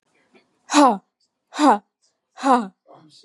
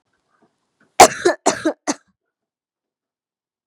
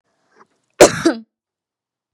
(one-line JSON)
{"exhalation_length": "3.2 s", "exhalation_amplitude": 30489, "exhalation_signal_mean_std_ratio": 0.35, "three_cough_length": "3.7 s", "three_cough_amplitude": 32768, "three_cough_signal_mean_std_ratio": 0.23, "cough_length": "2.1 s", "cough_amplitude": 32768, "cough_signal_mean_std_ratio": 0.24, "survey_phase": "beta (2021-08-13 to 2022-03-07)", "age": "18-44", "gender": "Female", "wearing_mask": "No", "symptom_none": true, "smoker_status": "Never smoked", "respiratory_condition_asthma": false, "respiratory_condition_other": false, "recruitment_source": "REACT", "submission_delay": "11 days", "covid_test_result": "Negative", "covid_test_method": "RT-qPCR", "influenza_a_test_result": "Negative", "influenza_b_test_result": "Negative"}